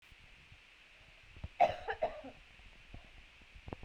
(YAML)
cough_length: 3.8 s
cough_amplitude: 5933
cough_signal_mean_std_ratio: 0.33
survey_phase: beta (2021-08-13 to 2022-03-07)
age: 18-44
gender: Female
wearing_mask: 'No'
symptom_cough_any: true
symptom_runny_or_blocked_nose: true
symptom_onset: 3 days
smoker_status: Never smoked
respiratory_condition_asthma: false
respiratory_condition_other: false
recruitment_source: Test and Trace
submission_delay: 1 day
covid_test_result: Positive
covid_test_method: RT-qPCR
covid_ct_value: 17.4
covid_ct_gene: ORF1ab gene